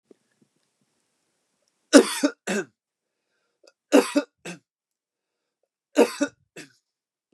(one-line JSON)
{"three_cough_length": "7.3 s", "three_cough_amplitude": 29204, "three_cough_signal_mean_std_ratio": 0.23, "survey_phase": "beta (2021-08-13 to 2022-03-07)", "age": "45-64", "gender": "Male", "wearing_mask": "No", "symptom_none": true, "symptom_onset": "12 days", "smoker_status": "Never smoked", "respiratory_condition_asthma": false, "respiratory_condition_other": false, "recruitment_source": "REACT", "submission_delay": "2 days", "covid_test_result": "Negative", "covid_test_method": "RT-qPCR", "influenza_a_test_result": "Negative", "influenza_b_test_result": "Negative"}